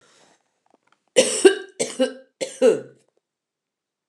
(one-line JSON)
{"three_cough_length": "4.1 s", "three_cough_amplitude": 29203, "three_cough_signal_mean_std_ratio": 0.32, "survey_phase": "alpha (2021-03-01 to 2021-08-12)", "age": "65+", "gender": "Female", "wearing_mask": "No", "symptom_fatigue": true, "smoker_status": "Never smoked", "respiratory_condition_asthma": true, "respiratory_condition_other": false, "recruitment_source": "REACT", "submission_delay": "2 days", "covid_test_result": "Negative", "covid_test_method": "RT-qPCR"}